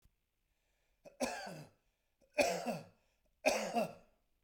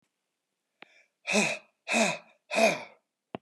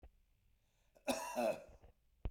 {"three_cough_length": "4.4 s", "three_cough_amplitude": 5362, "three_cough_signal_mean_std_ratio": 0.39, "exhalation_length": "3.4 s", "exhalation_amplitude": 11336, "exhalation_signal_mean_std_ratio": 0.4, "cough_length": "2.3 s", "cough_amplitude": 1819, "cough_signal_mean_std_ratio": 0.41, "survey_phase": "beta (2021-08-13 to 2022-03-07)", "age": "45-64", "gender": "Male", "wearing_mask": "No", "symptom_none": true, "smoker_status": "Never smoked", "respiratory_condition_asthma": false, "respiratory_condition_other": false, "recruitment_source": "REACT", "submission_delay": "3 days", "covid_test_result": "Negative", "covid_test_method": "RT-qPCR"}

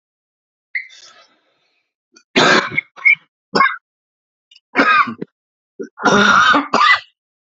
{"cough_length": "7.4 s", "cough_amplitude": 30434, "cough_signal_mean_std_ratio": 0.43, "survey_phase": "alpha (2021-03-01 to 2021-08-12)", "age": "45-64", "gender": "Male", "wearing_mask": "No", "symptom_cough_any": true, "symptom_new_continuous_cough": true, "symptom_shortness_of_breath": true, "symptom_fatigue": true, "symptom_headache": true, "symptom_onset": "1 day", "smoker_status": "Never smoked", "respiratory_condition_asthma": false, "respiratory_condition_other": false, "recruitment_source": "Test and Trace", "submission_delay": "0 days", "covid_test_result": "Negative", "covid_test_method": "RT-qPCR"}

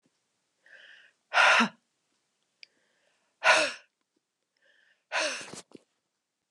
{"exhalation_length": "6.5 s", "exhalation_amplitude": 13004, "exhalation_signal_mean_std_ratio": 0.29, "survey_phase": "beta (2021-08-13 to 2022-03-07)", "age": "45-64", "gender": "Female", "wearing_mask": "No", "symptom_none": true, "smoker_status": "Ex-smoker", "respiratory_condition_asthma": false, "respiratory_condition_other": false, "recruitment_source": "REACT", "submission_delay": "2 days", "covid_test_result": "Negative", "covid_test_method": "RT-qPCR", "influenza_a_test_result": "Negative", "influenza_b_test_result": "Negative"}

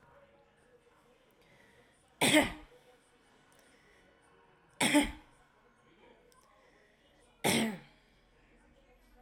{"three_cough_length": "9.2 s", "three_cough_amplitude": 7318, "three_cough_signal_mean_std_ratio": 0.27, "survey_phase": "alpha (2021-03-01 to 2021-08-12)", "age": "18-44", "gender": "Female", "wearing_mask": "No", "symptom_none": true, "smoker_status": "Prefer not to say", "respiratory_condition_asthma": false, "respiratory_condition_other": false, "recruitment_source": "REACT", "submission_delay": "1 day", "covid_test_result": "Negative", "covid_test_method": "RT-qPCR"}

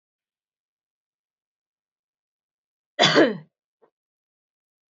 {"three_cough_length": "4.9 s", "three_cough_amplitude": 21970, "three_cough_signal_mean_std_ratio": 0.2, "survey_phase": "beta (2021-08-13 to 2022-03-07)", "age": "45-64", "gender": "Female", "wearing_mask": "No", "symptom_cough_any": true, "symptom_new_continuous_cough": true, "symptom_runny_or_blocked_nose": true, "symptom_shortness_of_breath": true, "symptom_abdominal_pain": true, "symptom_fatigue": true, "symptom_fever_high_temperature": true, "symptom_headache": true, "symptom_change_to_sense_of_smell_or_taste": true, "symptom_onset": "5 days", "smoker_status": "Never smoked", "respiratory_condition_asthma": false, "respiratory_condition_other": false, "recruitment_source": "Test and Trace", "submission_delay": "1 day", "covid_test_result": "Positive", "covid_test_method": "RT-qPCR"}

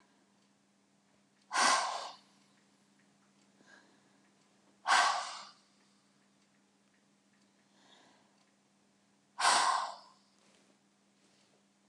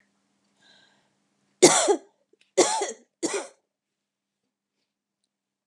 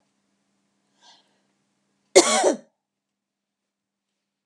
{"exhalation_length": "11.9 s", "exhalation_amplitude": 6333, "exhalation_signal_mean_std_ratio": 0.29, "three_cough_length": "5.7 s", "three_cough_amplitude": 30747, "three_cough_signal_mean_std_ratio": 0.26, "cough_length": "4.5 s", "cough_amplitude": 32768, "cough_signal_mean_std_ratio": 0.21, "survey_phase": "beta (2021-08-13 to 2022-03-07)", "age": "45-64", "gender": "Female", "wearing_mask": "No", "symptom_none": true, "smoker_status": "Ex-smoker", "respiratory_condition_asthma": false, "respiratory_condition_other": false, "recruitment_source": "REACT", "submission_delay": "1 day", "covid_test_result": "Negative", "covid_test_method": "RT-qPCR", "influenza_a_test_result": "Negative", "influenza_b_test_result": "Negative"}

